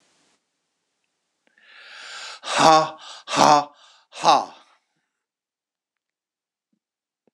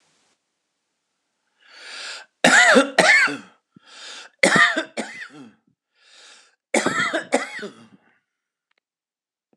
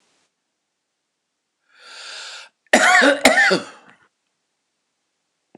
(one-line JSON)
{"exhalation_length": "7.3 s", "exhalation_amplitude": 26028, "exhalation_signal_mean_std_ratio": 0.27, "three_cough_length": "9.6 s", "three_cough_amplitude": 26028, "three_cough_signal_mean_std_ratio": 0.36, "cough_length": "5.6 s", "cough_amplitude": 26028, "cough_signal_mean_std_ratio": 0.33, "survey_phase": "beta (2021-08-13 to 2022-03-07)", "age": "65+", "gender": "Male", "wearing_mask": "No", "symptom_abdominal_pain": true, "symptom_diarrhoea": true, "symptom_fatigue": true, "symptom_onset": "12 days", "smoker_status": "Ex-smoker", "respiratory_condition_asthma": false, "respiratory_condition_other": false, "recruitment_source": "REACT", "submission_delay": "2 days", "covid_test_result": "Negative", "covid_test_method": "RT-qPCR", "influenza_a_test_result": "Negative", "influenza_b_test_result": "Negative"}